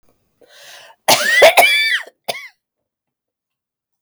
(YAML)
cough_length: 4.0 s
cough_amplitude: 32768
cough_signal_mean_std_ratio: 0.39
survey_phase: beta (2021-08-13 to 2022-03-07)
age: 45-64
gender: Female
wearing_mask: 'No'
symptom_none: true
smoker_status: Never smoked
respiratory_condition_asthma: false
respiratory_condition_other: false
recruitment_source: REACT
submission_delay: 2 days
covid_test_result: Negative
covid_test_method: RT-qPCR